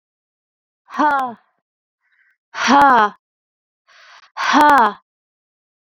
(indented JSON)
{
  "exhalation_length": "6.0 s",
  "exhalation_amplitude": 28278,
  "exhalation_signal_mean_std_ratio": 0.36,
  "survey_phase": "beta (2021-08-13 to 2022-03-07)",
  "age": "18-44",
  "gender": "Female",
  "wearing_mask": "Yes",
  "symptom_cough_any": true,
  "symptom_new_continuous_cough": true,
  "symptom_runny_or_blocked_nose": true,
  "symptom_shortness_of_breath": true,
  "symptom_sore_throat": true,
  "symptom_abdominal_pain": true,
  "symptom_diarrhoea": true,
  "symptom_fatigue": true,
  "symptom_headache": true,
  "symptom_change_to_sense_of_smell_or_taste": true,
  "symptom_loss_of_taste": true,
  "symptom_onset": "3 days",
  "smoker_status": "Ex-smoker",
  "respiratory_condition_asthma": false,
  "respiratory_condition_other": false,
  "recruitment_source": "Test and Trace",
  "submission_delay": "1 day",
  "covid_test_result": "Positive",
  "covid_test_method": "RT-qPCR",
  "covid_ct_value": 18.6,
  "covid_ct_gene": "ORF1ab gene",
  "covid_ct_mean": 19.4,
  "covid_viral_load": "440000 copies/ml",
  "covid_viral_load_category": "Low viral load (10K-1M copies/ml)"
}